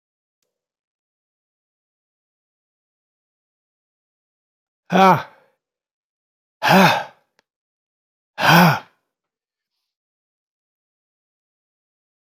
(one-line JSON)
{"exhalation_length": "12.3 s", "exhalation_amplitude": 30390, "exhalation_signal_mean_std_ratio": 0.23, "survey_phase": "beta (2021-08-13 to 2022-03-07)", "age": "65+", "gender": "Male", "wearing_mask": "No", "symptom_none": true, "symptom_onset": "13 days", "smoker_status": "Never smoked", "respiratory_condition_asthma": false, "respiratory_condition_other": false, "recruitment_source": "REACT", "submission_delay": "1 day", "covid_test_result": "Negative", "covid_test_method": "RT-qPCR", "influenza_a_test_result": "Unknown/Void", "influenza_b_test_result": "Unknown/Void"}